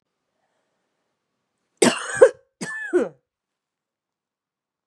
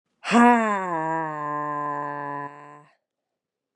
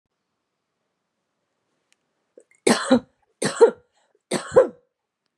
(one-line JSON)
{"cough_length": "4.9 s", "cough_amplitude": 32250, "cough_signal_mean_std_ratio": 0.23, "exhalation_length": "3.8 s", "exhalation_amplitude": 24615, "exhalation_signal_mean_std_ratio": 0.51, "three_cough_length": "5.4 s", "three_cough_amplitude": 28396, "three_cough_signal_mean_std_ratio": 0.26, "survey_phase": "beta (2021-08-13 to 2022-03-07)", "age": "18-44", "gender": "Female", "wearing_mask": "No", "symptom_cough_any": true, "symptom_new_continuous_cough": true, "symptom_shortness_of_breath": true, "symptom_sore_throat": true, "symptom_fatigue": true, "symptom_onset": "6 days", "smoker_status": "Ex-smoker", "respiratory_condition_asthma": false, "respiratory_condition_other": false, "recruitment_source": "Test and Trace", "submission_delay": "1 day", "covid_test_result": "Positive", "covid_test_method": "ePCR"}